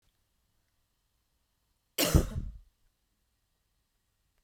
{"cough_length": "4.4 s", "cough_amplitude": 14899, "cough_signal_mean_std_ratio": 0.21, "survey_phase": "beta (2021-08-13 to 2022-03-07)", "age": "18-44", "gender": "Female", "wearing_mask": "No", "symptom_other": true, "smoker_status": "Never smoked", "respiratory_condition_asthma": false, "respiratory_condition_other": false, "recruitment_source": "Test and Trace", "submission_delay": "2 days", "covid_test_result": "Positive", "covid_test_method": "RT-qPCR", "covid_ct_value": 16.8, "covid_ct_gene": "N gene", "covid_ct_mean": 17.8, "covid_viral_load": "1400000 copies/ml", "covid_viral_load_category": "High viral load (>1M copies/ml)"}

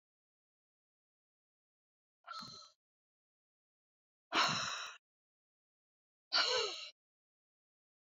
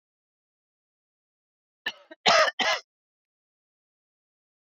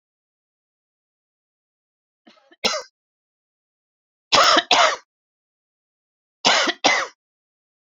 {"exhalation_length": "8.0 s", "exhalation_amplitude": 3549, "exhalation_signal_mean_std_ratio": 0.29, "cough_length": "4.8 s", "cough_amplitude": 14154, "cough_signal_mean_std_ratio": 0.24, "three_cough_length": "7.9 s", "three_cough_amplitude": 28723, "three_cough_signal_mean_std_ratio": 0.3, "survey_phase": "beta (2021-08-13 to 2022-03-07)", "age": "65+", "gender": "Female", "wearing_mask": "No", "symptom_none": true, "smoker_status": "Never smoked", "respiratory_condition_asthma": false, "respiratory_condition_other": false, "recruitment_source": "REACT", "submission_delay": "2 days", "covid_test_result": "Negative", "covid_test_method": "RT-qPCR", "influenza_a_test_result": "Negative", "influenza_b_test_result": "Negative"}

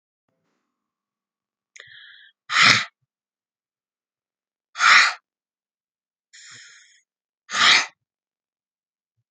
{"exhalation_length": "9.3 s", "exhalation_amplitude": 32768, "exhalation_signal_mean_std_ratio": 0.25, "survey_phase": "alpha (2021-03-01 to 2021-08-12)", "age": "45-64", "gender": "Female", "wearing_mask": "No", "symptom_none": true, "smoker_status": "Never smoked", "respiratory_condition_asthma": false, "respiratory_condition_other": false, "recruitment_source": "REACT", "submission_delay": "1 day", "covid_test_result": "Negative", "covid_test_method": "RT-qPCR"}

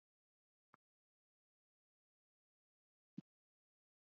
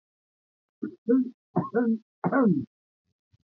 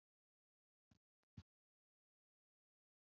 {"exhalation_length": "4.1 s", "exhalation_amplitude": 403, "exhalation_signal_mean_std_ratio": 0.06, "three_cough_length": "3.5 s", "three_cough_amplitude": 8060, "three_cough_signal_mean_std_ratio": 0.46, "cough_length": "3.1 s", "cough_amplitude": 150, "cough_signal_mean_std_ratio": 0.1, "survey_phase": "alpha (2021-03-01 to 2021-08-12)", "age": "65+", "gender": "Male", "wearing_mask": "No", "symptom_cough_any": true, "symptom_fatigue": true, "symptom_headache": true, "smoker_status": "Never smoked", "respiratory_condition_asthma": false, "respiratory_condition_other": false, "recruitment_source": "Test and Trace", "submission_delay": "3 days", "covid_test_result": "Positive", "covid_test_method": "LFT"}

